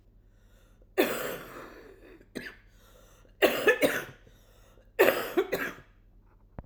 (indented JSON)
{
  "three_cough_length": "6.7 s",
  "three_cough_amplitude": 14480,
  "three_cough_signal_mean_std_ratio": 0.38,
  "survey_phase": "alpha (2021-03-01 to 2021-08-12)",
  "age": "45-64",
  "gender": "Female",
  "wearing_mask": "No",
  "symptom_cough_any": true,
  "symptom_headache": true,
  "symptom_onset": "4 days",
  "smoker_status": "Ex-smoker",
  "respiratory_condition_asthma": false,
  "respiratory_condition_other": false,
  "recruitment_source": "Test and Trace",
  "submission_delay": "2 days",
  "covid_test_result": "Positive",
  "covid_test_method": "RT-qPCR",
  "covid_ct_value": 28.6,
  "covid_ct_gene": "N gene"
}